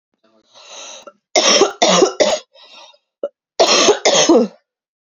{"cough_length": "5.1 s", "cough_amplitude": 32768, "cough_signal_mean_std_ratio": 0.5, "survey_phase": "beta (2021-08-13 to 2022-03-07)", "age": "18-44", "gender": "Female", "wearing_mask": "No", "symptom_cough_any": true, "symptom_runny_or_blocked_nose": true, "symptom_shortness_of_breath": true, "symptom_fatigue": true, "symptom_headache": true, "symptom_change_to_sense_of_smell_or_taste": true, "symptom_loss_of_taste": true, "symptom_onset": "4 days", "smoker_status": "Ex-smoker", "respiratory_condition_asthma": false, "respiratory_condition_other": false, "recruitment_source": "Test and Trace", "submission_delay": "3 days", "covid_test_result": "Positive", "covid_test_method": "RT-qPCR", "covid_ct_value": 15.9, "covid_ct_gene": "ORF1ab gene", "covid_ct_mean": 16.1, "covid_viral_load": "5300000 copies/ml", "covid_viral_load_category": "High viral load (>1M copies/ml)"}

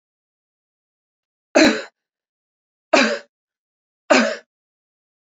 {"three_cough_length": "5.2 s", "three_cough_amplitude": 31315, "three_cough_signal_mean_std_ratio": 0.28, "survey_phase": "beta (2021-08-13 to 2022-03-07)", "age": "45-64", "gender": "Female", "wearing_mask": "Yes", "symptom_cough_any": true, "symptom_runny_or_blocked_nose": true, "symptom_sore_throat": true, "smoker_status": "Ex-smoker", "respiratory_condition_asthma": false, "respiratory_condition_other": false, "recruitment_source": "Test and Trace", "submission_delay": "2 days", "covid_test_result": "Positive", "covid_test_method": "LFT"}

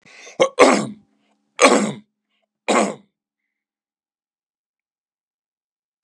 {"three_cough_length": "6.0 s", "three_cough_amplitude": 32768, "three_cough_signal_mean_std_ratio": 0.29, "survey_phase": "beta (2021-08-13 to 2022-03-07)", "age": "65+", "gender": "Male", "wearing_mask": "No", "symptom_none": true, "smoker_status": "Never smoked", "respiratory_condition_asthma": false, "respiratory_condition_other": false, "recruitment_source": "REACT", "submission_delay": "3 days", "covid_test_result": "Negative", "covid_test_method": "RT-qPCR", "influenza_a_test_result": "Negative", "influenza_b_test_result": "Negative"}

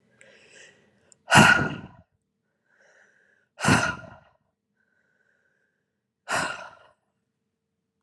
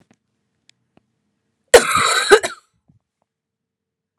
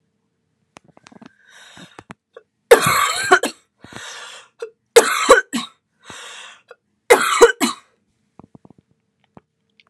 {"exhalation_length": "8.0 s", "exhalation_amplitude": 26541, "exhalation_signal_mean_std_ratio": 0.26, "cough_length": "4.2 s", "cough_amplitude": 32768, "cough_signal_mean_std_ratio": 0.27, "three_cough_length": "9.9 s", "three_cough_amplitude": 32768, "three_cough_signal_mean_std_ratio": 0.3, "survey_phase": "beta (2021-08-13 to 2022-03-07)", "age": "18-44", "gender": "Female", "wearing_mask": "No", "symptom_cough_any": true, "symptom_runny_or_blocked_nose": true, "symptom_sore_throat": true, "symptom_fatigue": true, "symptom_fever_high_temperature": true, "symptom_headache": true, "symptom_onset": "4 days", "smoker_status": "Never smoked", "respiratory_condition_asthma": false, "respiratory_condition_other": false, "recruitment_source": "Test and Trace", "submission_delay": "2 days", "covid_test_result": "Positive", "covid_test_method": "RT-qPCR", "covid_ct_value": 19.5, "covid_ct_gene": "ORF1ab gene", "covid_ct_mean": 19.9, "covid_viral_load": "300000 copies/ml", "covid_viral_load_category": "Low viral load (10K-1M copies/ml)"}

